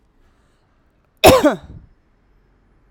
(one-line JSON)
{"cough_length": "2.9 s", "cough_amplitude": 32768, "cough_signal_mean_std_ratio": 0.26, "survey_phase": "alpha (2021-03-01 to 2021-08-12)", "age": "45-64", "gender": "Female", "wearing_mask": "No", "symptom_none": true, "symptom_onset": "3 days", "smoker_status": "Never smoked", "respiratory_condition_asthma": false, "respiratory_condition_other": false, "recruitment_source": "Test and Trace", "submission_delay": "2 days", "covid_test_result": "Positive", "covid_test_method": "RT-qPCR", "covid_ct_value": 24.6, "covid_ct_gene": "ORF1ab gene", "covid_ct_mean": 25.1, "covid_viral_load": "5700 copies/ml", "covid_viral_load_category": "Minimal viral load (< 10K copies/ml)"}